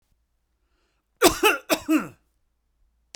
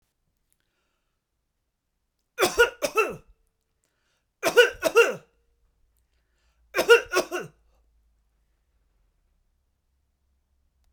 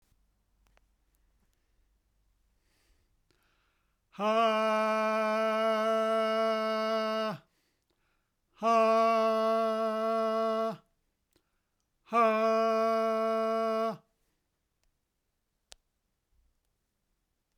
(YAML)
cough_length: 3.2 s
cough_amplitude: 31885
cough_signal_mean_std_ratio: 0.31
three_cough_length: 10.9 s
three_cough_amplitude: 23208
three_cough_signal_mean_std_ratio: 0.25
exhalation_length: 17.6 s
exhalation_amplitude: 5517
exhalation_signal_mean_std_ratio: 0.59
survey_phase: beta (2021-08-13 to 2022-03-07)
age: 45-64
gender: Male
wearing_mask: 'No'
symptom_sore_throat: true
symptom_fever_high_temperature: true
smoker_status: Never smoked
respiratory_condition_asthma: false
respiratory_condition_other: false
recruitment_source: REACT
submission_delay: 2 days
covid_test_result: Negative
covid_test_method: RT-qPCR